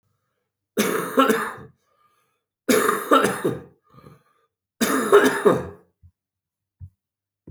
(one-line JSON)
{"three_cough_length": "7.5 s", "three_cough_amplitude": 26752, "three_cough_signal_mean_std_ratio": 0.42, "survey_phase": "beta (2021-08-13 to 2022-03-07)", "age": "45-64", "gender": "Male", "wearing_mask": "No", "symptom_cough_any": true, "symptom_runny_or_blocked_nose": true, "symptom_sore_throat": true, "symptom_fatigue": true, "symptom_headache": true, "smoker_status": "Never smoked", "respiratory_condition_asthma": false, "respiratory_condition_other": false, "recruitment_source": "Test and Trace", "submission_delay": "2 days", "covid_test_result": "Positive", "covid_test_method": "RT-qPCR", "covid_ct_value": 23.1, "covid_ct_gene": "ORF1ab gene"}